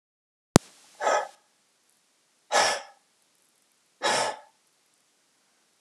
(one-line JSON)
{"exhalation_length": "5.8 s", "exhalation_amplitude": 32768, "exhalation_signal_mean_std_ratio": 0.27, "survey_phase": "alpha (2021-03-01 to 2021-08-12)", "age": "18-44", "gender": "Male", "wearing_mask": "No", "symptom_cough_any": true, "symptom_fatigue": true, "smoker_status": "Never smoked", "respiratory_condition_asthma": false, "respiratory_condition_other": false, "recruitment_source": "REACT", "submission_delay": "1 day", "covid_test_result": "Negative", "covid_test_method": "RT-qPCR"}